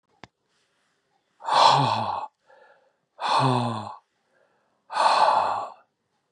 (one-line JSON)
{"exhalation_length": "6.3 s", "exhalation_amplitude": 23594, "exhalation_signal_mean_std_ratio": 0.47, "survey_phase": "beta (2021-08-13 to 2022-03-07)", "age": "45-64", "gender": "Male", "wearing_mask": "No", "symptom_none": true, "smoker_status": "Never smoked", "respiratory_condition_asthma": false, "respiratory_condition_other": false, "recruitment_source": "REACT", "submission_delay": "0 days", "covid_test_result": "Negative", "covid_test_method": "RT-qPCR"}